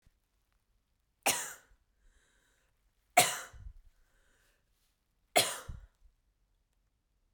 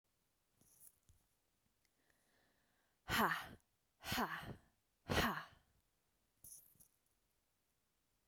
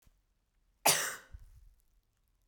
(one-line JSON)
{"three_cough_length": "7.3 s", "three_cough_amplitude": 11153, "three_cough_signal_mean_std_ratio": 0.22, "exhalation_length": "8.3 s", "exhalation_amplitude": 2457, "exhalation_signal_mean_std_ratio": 0.29, "cough_length": "2.5 s", "cough_amplitude": 8558, "cough_signal_mean_std_ratio": 0.27, "survey_phase": "beta (2021-08-13 to 2022-03-07)", "age": "18-44", "gender": "Female", "wearing_mask": "No", "symptom_none": true, "smoker_status": "Ex-smoker", "respiratory_condition_asthma": false, "respiratory_condition_other": false, "recruitment_source": "REACT", "submission_delay": "1 day", "covid_test_result": "Negative", "covid_test_method": "RT-qPCR"}